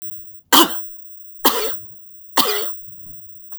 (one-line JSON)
{"three_cough_length": "3.6 s", "three_cough_amplitude": 32768, "three_cough_signal_mean_std_ratio": 0.77, "survey_phase": "beta (2021-08-13 to 2022-03-07)", "age": "45-64", "gender": "Female", "wearing_mask": "No", "symptom_none": true, "smoker_status": "Ex-smoker", "respiratory_condition_asthma": false, "respiratory_condition_other": false, "recruitment_source": "REACT", "submission_delay": "1 day", "covid_test_result": "Negative", "covid_test_method": "RT-qPCR", "influenza_a_test_result": "Negative", "influenza_b_test_result": "Negative"}